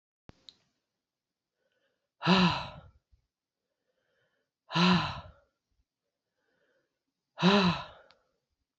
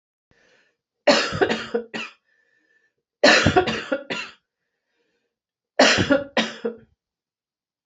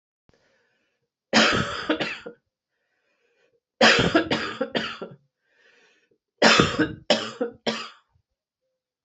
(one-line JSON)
{"exhalation_length": "8.8 s", "exhalation_amplitude": 10479, "exhalation_signal_mean_std_ratio": 0.3, "cough_length": "7.9 s", "cough_amplitude": 30508, "cough_signal_mean_std_ratio": 0.38, "three_cough_length": "9.0 s", "three_cough_amplitude": 25017, "three_cough_signal_mean_std_ratio": 0.39, "survey_phase": "alpha (2021-03-01 to 2021-08-12)", "age": "45-64", "gender": "Female", "wearing_mask": "No", "symptom_cough_any": true, "symptom_new_continuous_cough": true, "symptom_headache": true, "smoker_status": "Ex-smoker", "respiratory_condition_asthma": false, "respiratory_condition_other": false, "recruitment_source": "Test and Trace", "submission_delay": "2 days", "covid_test_result": "Positive", "covid_test_method": "RT-qPCR", "covid_ct_value": 17.8, "covid_ct_gene": "ORF1ab gene", "covid_ct_mean": 17.9, "covid_viral_load": "1300000 copies/ml", "covid_viral_load_category": "High viral load (>1M copies/ml)"}